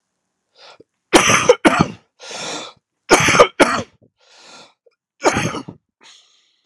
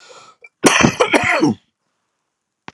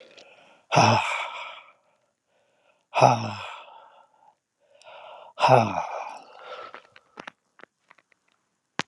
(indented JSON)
{
  "three_cough_length": "6.7 s",
  "three_cough_amplitude": 32768,
  "three_cough_signal_mean_std_ratio": 0.37,
  "cough_length": "2.7 s",
  "cough_amplitude": 32768,
  "cough_signal_mean_std_ratio": 0.43,
  "exhalation_length": "8.9 s",
  "exhalation_amplitude": 25609,
  "exhalation_signal_mean_std_ratio": 0.32,
  "survey_phase": "alpha (2021-03-01 to 2021-08-12)",
  "age": "45-64",
  "gender": "Male",
  "wearing_mask": "No",
  "symptom_cough_any": true,
  "symptom_fatigue": true,
  "symptom_fever_high_temperature": true,
  "symptom_headache": true,
  "smoker_status": "Never smoked",
  "respiratory_condition_asthma": false,
  "respiratory_condition_other": false,
  "recruitment_source": "Test and Trace",
  "submission_delay": "2 days",
  "covid_test_result": "Positive",
  "covid_test_method": "RT-qPCR"
}